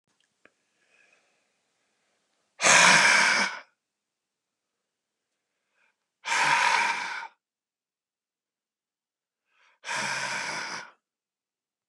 exhalation_length: 11.9 s
exhalation_amplitude: 20034
exhalation_signal_mean_std_ratio: 0.34
survey_phase: beta (2021-08-13 to 2022-03-07)
age: 45-64
gender: Male
wearing_mask: 'No'
symptom_none: true
smoker_status: Never smoked
respiratory_condition_asthma: false
respiratory_condition_other: false
recruitment_source: REACT
submission_delay: 4 days
covid_test_result: Negative
covid_test_method: RT-qPCR
influenza_a_test_result: Unknown/Void
influenza_b_test_result: Unknown/Void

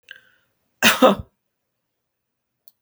cough_length: 2.8 s
cough_amplitude: 32768
cough_signal_mean_std_ratio: 0.25
survey_phase: beta (2021-08-13 to 2022-03-07)
age: 65+
gender: Female
wearing_mask: 'No'
symptom_none: true
smoker_status: Never smoked
respiratory_condition_asthma: false
respiratory_condition_other: false
recruitment_source: REACT
submission_delay: 2 days
covid_test_result: Negative
covid_test_method: RT-qPCR
influenza_a_test_result: Negative
influenza_b_test_result: Negative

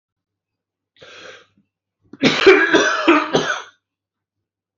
three_cough_length: 4.8 s
three_cough_amplitude: 29032
three_cough_signal_mean_std_ratio: 0.4
survey_phase: beta (2021-08-13 to 2022-03-07)
age: 65+
gender: Male
wearing_mask: 'No'
symptom_runny_or_blocked_nose: true
symptom_headache: true
symptom_onset: 4 days
smoker_status: Never smoked
respiratory_condition_asthma: true
respiratory_condition_other: false
recruitment_source: REACT
submission_delay: 1 day
covid_test_result: Negative
covid_test_method: RT-qPCR
influenza_a_test_result: Negative
influenza_b_test_result: Negative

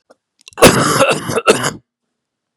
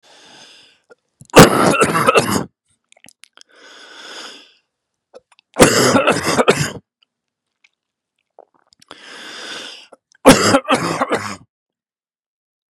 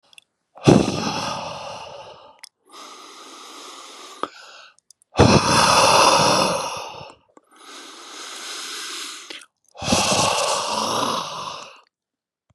cough_length: 2.6 s
cough_amplitude: 32768
cough_signal_mean_std_ratio: 0.47
three_cough_length: 12.7 s
three_cough_amplitude: 32768
three_cough_signal_mean_std_ratio: 0.36
exhalation_length: 12.5 s
exhalation_amplitude: 32768
exhalation_signal_mean_std_ratio: 0.49
survey_phase: beta (2021-08-13 to 2022-03-07)
age: 45-64
gender: Male
wearing_mask: 'No'
symptom_cough_any: true
symptom_runny_or_blocked_nose: true
symptom_shortness_of_breath: true
symptom_abdominal_pain: true
symptom_fatigue: true
symptom_fever_high_temperature: true
symptom_headache: true
symptom_onset: 3 days
smoker_status: Never smoked
respiratory_condition_asthma: false
respiratory_condition_other: false
recruitment_source: Test and Trace
submission_delay: 1 day
covid_test_result: Positive
covid_test_method: RT-qPCR
covid_ct_value: 17.9
covid_ct_gene: N gene
covid_ct_mean: 18.2
covid_viral_load: 1100000 copies/ml
covid_viral_load_category: High viral load (>1M copies/ml)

